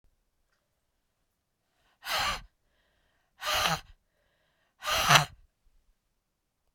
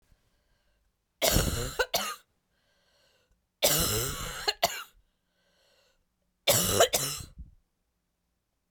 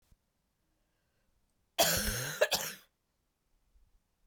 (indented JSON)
{
  "exhalation_length": "6.7 s",
  "exhalation_amplitude": 22702,
  "exhalation_signal_mean_std_ratio": 0.28,
  "three_cough_length": "8.7 s",
  "three_cough_amplitude": 16094,
  "three_cough_signal_mean_std_ratio": 0.4,
  "cough_length": "4.3 s",
  "cough_amplitude": 6687,
  "cough_signal_mean_std_ratio": 0.33,
  "survey_phase": "beta (2021-08-13 to 2022-03-07)",
  "age": "45-64",
  "gender": "Female",
  "wearing_mask": "No",
  "symptom_cough_any": true,
  "symptom_runny_or_blocked_nose": true,
  "symptom_sore_throat": true,
  "symptom_fatigue": true,
  "symptom_headache": true,
  "smoker_status": "Ex-smoker",
  "respiratory_condition_asthma": false,
  "respiratory_condition_other": false,
  "recruitment_source": "Test and Trace",
  "submission_delay": "2 days",
  "covid_test_result": "Positive",
  "covid_test_method": "RT-qPCR",
  "covid_ct_value": 16.5,
  "covid_ct_gene": "ORF1ab gene",
  "covid_ct_mean": 17.3,
  "covid_viral_load": "2100000 copies/ml",
  "covid_viral_load_category": "High viral load (>1M copies/ml)"
}